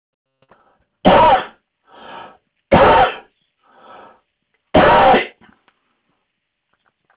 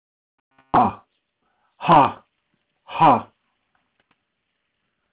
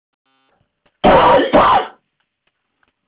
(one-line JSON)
{"three_cough_length": "7.2 s", "three_cough_amplitude": 31817, "three_cough_signal_mean_std_ratio": 0.37, "exhalation_length": "5.1 s", "exhalation_amplitude": 25523, "exhalation_signal_mean_std_ratio": 0.28, "cough_length": "3.1 s", "cough_amplitude": 31560, "cough_signal_mean_std_ratio": 0.44, "survey_phase": "beta (2021-08-13 to 2022-03-07)", "age": "65+", "gender": "Male", "wearing_mask": "No", "symptom_cough_any": true, "symptom_fatigue": true, "symptom_headache": true, "symptom_onset": "10 days", "smoker_status": "Ex-smoker", "respiratory_condition_asthma": false, "respiratory_condition_other": false, "recruitment_source": "REACT", "submission_delay": "1 day", "covid_test_result": "Negative", "covid_test_method": "RT-qPCR"}